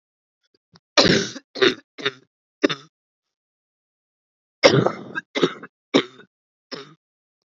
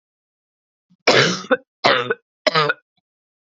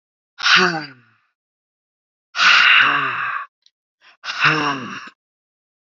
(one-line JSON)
{"cough_length": "7.5 s", "cough_amplitude": 32767, "cough_signal_mean_std_ratio": 0.29, "three_cough_length": "3.6 s", "three_cough_amplitude": 32767, "three_cough_signal_mean_std_ratio": 0.38, "exhalation_length": "5.9 s", "exhalation_amplitude": 30118, "exhalation_signal_mean_std_ratio": 0.46, "survey_phase": "beta (2021-08-13 to 2022-03-07)", "age": "18-44", "gender": "Female", "wearing_mask": "No", "symptom_cough_any": true, "symptom_new_continuous_cough": true, "symptom_runny_or_blocked_nose": true, "symptom_sore_throat": true, "symptom_headache": true, "symptom_onset": "6 days", "smoker_status": "Never smoked", "respiratory_condition_asthma": false, "respiratory_condition_other": false, "recruitment_source": "Test and Trace", "submission_delay": "2 days", "covid_test_result": "Negative", "covid_test_method": "RT-qPCR"}